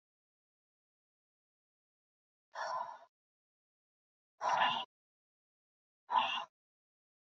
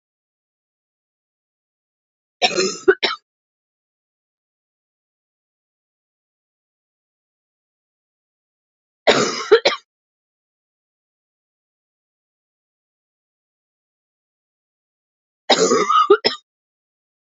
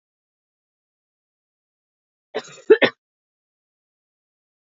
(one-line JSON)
{"exhalation_length": "7.3 s", "exhalation_amplitude": 4181, "exhalation_signal_mean_std_ratio": 0.29, "three_cough_length": "17.2 s", "three_cough_amplitude": 32768, "three_cough_signal_mean_std_ratio": 0.23, "cough_length": "4.8 s", "cough_amplitude": 27304, "cough_signal_mean_std_ratio": 0.14, "survey_phase": "beta (2021-08-13 to 2022-03-07)", "age": "45-64", "gender": "Female", "wearing_mask": "No", "symptom_cough_any": true, "symptom_runny_or_blocked_nose": true, "symptom_shortness_of_breath": true, "symptom_fatigue": true, "symptom_headache": true, "symptom_other": true, "smoker_status": "Never smoked", "respiratory_condition_asthma": false, "respiratory_condition_other": false, "recruitment_source": "Test and Trace", "submission_delay": "2 days", "covid_test_result": "Positive", "covid_test_method": "RT-qPCR", "covid_ct_value": 28.1, "covid_ct_gene": "ORF1ab gene"}